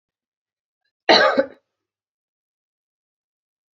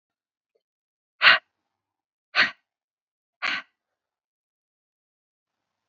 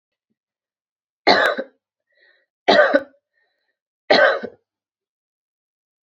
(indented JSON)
{
  "cough_length": "3.8 s",
  "cough_amplitude": 29156,
  "cough_signal_mean_std_ratio": 0.23,
  "exhalation_length": "5.9 s",
  "exhalation_amplitude": 25766,
  "exhalation_signal_mean_std_ratio": 0.19,
  "three_cough_length": "6.1 s",
  "three_cough_amplitude": 31041,
  "three_cough_signal_mean_std_ratio": 0.31,
  "survey_phase": "beta (2021-08-13 to 2022-03-07)",
  "age": "45-64",
  "gender": "Female",
  "wearing_mask": "No",
  "symptom_runny_or_blocked_nose": true,
  "symptom_diarrhoea": true,
  "symptom_fatigue": true,
  "symptom_headache": true,
  "symptom_change_to_sense_of_smell_or_taste": true,
  "symptom_loss_of_taste": true,
  "symptom_onset": "4 days",
  "smoker_status": "Never smoked",
  "respiratory_condition_asthma": false,
  "respiratory_condition_other": false,
  "recruitment_source": "Test and Trace",
  "submission_delay": "1 day",
  "covid_test_result": "Positive",
  "covid_test_method": "RT-qPCR",
  "covid_ct_value": 16.3,
  "covid_ct_gene": "ORF1ab gene",
  "covid_ct_mean": 16.8,
  "covid_viral_load": "3100000 copies/ml",
  "covid_viral_load_category": "High viral load (>1M copies/ml)"
}